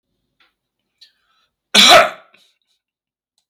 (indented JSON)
{
  "cough_length": "3.5 s",
  "cough_amplitude": 32768,
  "cough_signal_mean_std_ratio": 0.26,
  "survey_phase": "beta (2021-08-13 to 2022-03-07)",
  "age": "65+",
  "gender": "Male",
  "wearing_mask": "No",
  "symptom_none": true,
  "smoker_status": "Ex-smoker",
  "respiratory_condition_asthma": false,
  "respiratory_condition_other": false,
  "recruitment_source": "REACT",
  "submission_delay": "1 day",
  "covid_test_result": "Negative",
  "covid_test_method": "RT-qPCR",
  "influenza_a_test_result": "Negative",
  "influenza_b_test_result": "Negative"
}